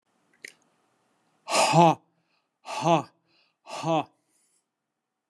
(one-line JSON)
{"exhalation_length": "5.3 s", "exhalation_amplitude": 18106, "exhalation_signal_mean_std_ratio": 0.32, "survey_phase": "beta (2021-08-13 to 2022-03-07)", "age": "45-64", "gender": "Male", "wearing_mask": "No", "symptom_none": true, "smoker_status": "Never smoked", "respiratory_condition_asthma": false, "respiratory_condition_other": false, "recruitment_source": "REACT", "submission_delay": "2 days", "covid_test_result": "Negative", "covid_test_method": "RT-qPCR"}